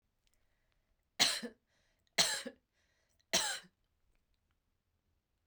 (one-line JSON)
{"three_cough_length": "5.5 s", "three_cough_amplitude": 7807, "three_cough_signal_mean_std_ratio": 0.27, "survey_phase": "beta (2021-08-13 to 2022-03-07)", "age": "45-64", "gender": "Female", "wearing_mask": "No", "symptom_cough_any": true, "symptom_runny_or_blocked_nose": true, "symptom_shortness_of_breath": true, "symptom_headache": true, "symptom_change_to_sense_of_smell_or_taste": true, "symptom_loss_of_taste": true, "symptom_other": true, "symptom_onset": "3 days", "smoker_status": "Never smoked", "respiratory_condition_asthma": true, "respiratory_condition_other": false, "recruitment_source": "Test and Trace", "submission_delay": "2 days", "covid_test_result": "Positive", "covid_test_method": "RT-qPCR", "covid_ct_value": 26.9, "covid_ct_gene": "N gene"}